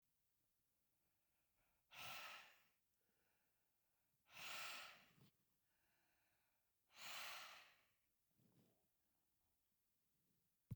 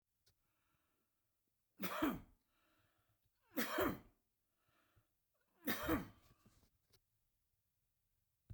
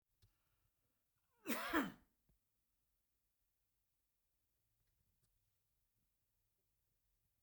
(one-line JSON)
{"exhalation_length": "10.8 s", "exhalation_amplitude": 346, "exhalation_signal_mean_std_ratio": 0.39, "three_cough_length": "8.5 s", "three_cough_amplitude": 1990, "three_cough_signal_mean_std_ratio": 0.3, "cough_length": "7.4 s", "cough_amplitude": 1696, "cough_signal_mean_std_ratio": 0.2, "survey_phase": "beta (2021-08-13 to 2022-03-07)", "age": "65+", "gender": "Male", "wearing_mask": "No", "symptom_cough_any": true, "smoker_status": "Ex-smoker", "respiratory_condition_asthma": false, "respiratory_condition_other": false, "recruitment_source": "REACT", "submission_delay": "1 day", "covid_test_result": "Negative", "covid_test_method": "RT-qPCR"}